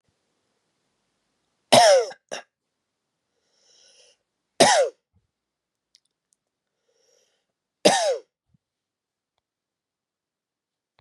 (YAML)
three_cough_length: 11.0 s
three_cough_amplitude: 31190
three_cough_signal_mean_std_ratio: 0.23
survey_phase: beta (2021-08-13 to 2022-03-07)
age: 45-64
gender: Male
wearing_mask: 'No'
symptom_cough_any: true
symptom_runny_or_blocked_nose: true
symptom_sore_throat: true
symptom_headache: true
symptom_change_to_sense_of_smell_or_taste: true
symptom_loss_of_taste: true
symptom_onset: 4 days
smoker_status: Never smoked
respiratory_condition_asthma: false
respiratory_condition_other: false
recruitment_source: Test and Trace
submission_delay: 2 days
covid_test_result: Positive
covid_test_method: RT-qPCR
covid_ct_value: 19.1
covid_ct_gene: ORF1ab gene